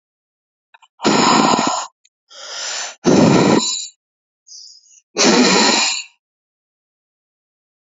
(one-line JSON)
{"exhalation_length": "7.9 s", "exhalation_amplitude": 32768, "exhalation_signal_mean_std_ratio": 0.49, "survey_phase": "alpha (2021-03-01 to 2021-08-12)", "age": "45-64", "gender": "Female", "wearing_mask": "No", "symptom_cough_any": true, "symptom_abdominal_pain": true, "symptom_fatigue": true, "symptom_headache": true, "symptom_onset": "3 days", "smoker_status": "Never smoked", "respiratory_condition_asthma": false, "respiratory_condition_other": false, "recruitment_source": "Test and Trace", "submission_delay": "2 days", "covid_test_result": "Positive", "covid_test_method": "RT-qPCR", "covid_ct_value": 16.1, "covid_ct_gene": "ORF1ab gene", "covid_ct_mean": 16.3, "covid_viral_load": "4400000 copies/ml", "covid_viral_load_category": "High viral load (>1M copies/ml)"}